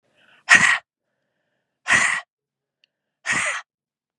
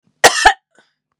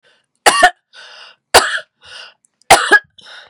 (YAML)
exhalation_length: 4.2 s
exhalation_amplitude: 32376
exhalation_signal_mean_std_ratio: 0.34
cough_length: 1.2 s
cough_amplitude: 32768
cough_signal_mean_std_ratio: 0.34
three_cough_length: 3.5 s
three_cough_amplitude: 32768
three_cough_signal_mean_std_ratio: 0.35
survey_phase: beta (2021-08-13 to 2022-03-07)
age: 45-64
gender: Female
wearing_mask: 'No'
symptom_cough_any: true
symptom_runny_or_blocked_nose: true
symptom_shortness_of_breath: true
symptom_sore_throat: true
smoker_status: Never smoked
respiratory_condition_asthma: false
respiratory_condition_other: false
recruitment_source: Test and Trace
submission_delay: 2 days
covid_test_result: Positive
covid_test_method: RT-qPCR